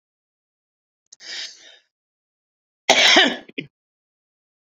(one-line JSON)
{"cough_length": "4.7 s", "cough_amplitude": 30700, "cough_signal_mean_std_ratio": 0.27, "survey_phase": "beta (2021-08-13 to 2022-03-07)", "age": "65+", "gender": "Female", "wearing_mask": "No", "symptom_cough_any": true, "symptom_shortness_of_breath": true, "symptom_fatigue": true, "smoker_status": "Ex-smoker", "respiratory_condition_asthma": false, "respiratory_condition_other": false, "recruitment_source": "REACT", "submission_delay": "1 day", "covid_test_result": "Negative", "covid_test_method": "RT-qPCR"}